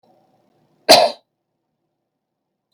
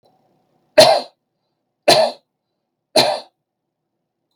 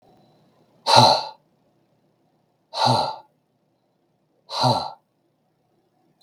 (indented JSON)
{
  "cough_length": "2.7 s",
  "cough_amplitude": 32768,
  "cough_signal_mean_std_ratio": 0.22,
  "three_cough_length": "4.4 s",
  "three_cough_amplitude": 32768,
  "three_cough_signal_mean_std_ratio": 0.3,
  "exhalation_length": "6.2 s",
  "exhalation_amplitude": 32767,
  "exhalation_signal_mean_std_ratio": 0.31,
  "survey_phase": "beta (2021-08-13 to 2022-03-07)",
  "age": "45-64",
  "gender": "Male",
  "wearing_mask": "No",
  "symptom_none": true,
  "smoker_status": "Never smoked",
  "respiratory_condition_asthma": false,
  "respiratory_condition_other": false,
  "recruitment_source": "REACT",
  "submission_delay": "2 days",
  "covid_test_result": "Negative",
  "covid_test_method": "RT-qPCR"
}